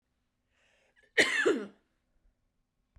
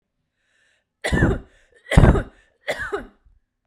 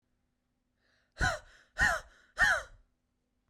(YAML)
cough_length: 3.0 s
cough_amplitude: 10165
cough_signal_mean_std_ratio: 0.3
three_cough_length: 3.7 s
three_cough_amplitude: 32768
three_cough_signal_mean_std_ratio: 0.34
exhalation_length: 3.5 s
exhalation_amplitude: 6488
exhalation_signal_mean_std_ratio: 0.35
survey_phase: beta (2021-08-13 to 2022-03-07)
age: 18-44
gender: Female
wearing_mask: 'No'
symptom_none: true
smoker_status: Never smoked
respiratory_condition_asthma: false
respiratory_condition_other: false
recruitment_source: REACT
submission_delay: 1 day
covid_test_result: Positive
covid_test_method: RT-qPCR
covid_ct_value: 36.0
covid_ct_gene: N gene
influenza_a_test_result: Negative
influenza_b_test_result: Negative